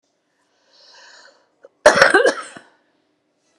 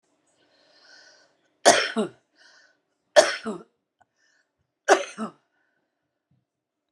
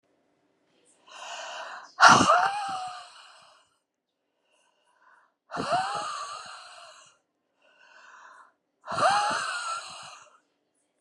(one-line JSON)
{"cough_length": "3.6 s", "cough_amplitude": 32768, "cough_signal_mean_std_ratio": 0.28, "three_cough_length": "6.9 s", "three_cough_amplitude": 28963, "three_cough_signal_mean_std_ratio": 0.24, "exhalation_length": "11.0 s", "exhalation_amplitude": 24535, "exhalation_signal_mean_std_ratio": 0.35, "survey_phase": "beta (2021-08-13 to 2022-03-07)", "age": "45-64", "gender": "Female", "wearing_mask": "No", "symptom_runny_or_blocked_nose": true, "symptom_onset": "7 days", "smoker_status": "Ex-smoker", "respiratory_condition_asthma": false, "respiratory_condition_other": false, "recruitment_source": "REACT", "submission_delay": "2 days", "covid_test_result": "Negative", "covid_test_method": "RT-qPCR"}